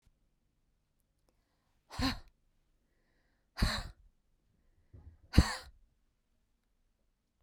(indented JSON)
{
  "exhalation_length": "7.4 s",
  "exhalation_amplitude": 14199,
  "exhalation_signal_mean_std_ratio": 0.2,
  "survey_phase": "beta (2021-08-13 to 2022-03-07)",
  "age": "45-64",
  "gender": "Female",
  "wearing_mask": "No",
  "symptom_none": true,
  "smoker_status": "Never smoked",
  "respiratory_condition_asthma": false,
  "respiratory_condition_other": false,
  "recruitment_source": "REACT",
  "submission_delay": "2 days",
  "covid_test_result": "Negative",
  "covid_test_method": "RT-qPCR",
  "influenza_a_test_result": "Unknown/Void",
  "influenza_b_test_result": "Unknown/Void"
}